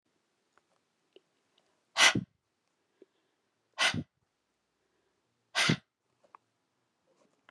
{"exhalation_length": "7.5 s", "exhalation_amplitude": 12264, "exhalation_signal_mean_std_ratio": 0.22, "survey_phase": "beta (2021-08-13 to 2022-03-07)", "age": "45-64", "gender": "Female", "wearing_mask": "No", "symptom_none": true, "smoker_status": "Never smoked", "respiratory_condition_asthma": false, "respiratory_condition_other": false, "recruitment_source": "REACT", "submission_delay": "1 day", "covid_test_result": "Negative", "covid_test_method": "RT-qPCR"}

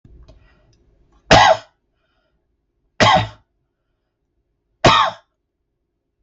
{"three_cough_length": "6.2 s", "three_cough_amplitude": 32768, "three_cough_signal_mean_std_ratio": 0.29, "survey_phase": "beta (2021-08-13 to 2022-03-07)", "age": "65+", "gender": "Male", "wearing_mask": "No", "symptom_none": true, "smoker_status": "Ex-smoker", "respiratory_condition_asthma": false, "respiratory_condition_other": false, "recruitment_source": "REACT", "submission_delay": "8 days", "covid_test_result": "Negative", "covid_test_method": "RT-qPCR"}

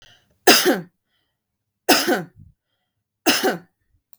{"three_cough_length": "4.2 s", "three_cough_amplitude": 32768, "three_cough_signal_mean_std_ratio": 0.35, "survey_phase": "beta (2021-08-13 to 2022-03-07)", "age": "45-64", "gender": "Female", "wearing_mask": "No", "symptom_headache": true, "smoker_status": "Never smoked", "respiratory_condition_asthma": false, "respiratory_condition_other": false, "recruitment_source": "REACT", "submission_delay": "1 day", "covid_test_result": "Negative", "covid_test_method": "RT-qPCR", "influenza_a_test_result": "Negative", "influenza_b_test_result": "Negative"}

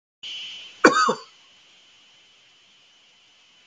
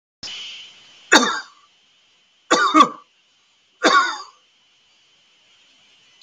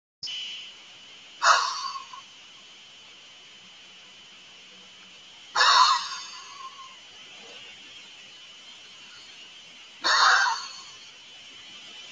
{"cough_length": "3.7 s", "cough_amplitude": 32768, "cough_signal_mean_std_ratio": 0.27, "three_cough_length": "6.2 s", "three_cough_amplitude": 32768, "three_cough_signal_mean_std_ratio": 0.32, "exhalation_length": "12.1 s", "exhalation_amplitude": 18282, "exhalation_signal_mean_std_ratio": 0.39, "survey_phase": "beta (2021-08-13 to 2022-03-07)", "age": "65+", "gender": "Male", "wearing_mask": "No", "symptom_none": true, "smoker_status": "Never smoked", "respiratory_condition_asthma": true, "respiratory_condition_other": false, "recruitment_source": "Test and Trace", "submission_delay": "0 days", "covid_test_result": "Negative", "covid_test_method": "LFT"}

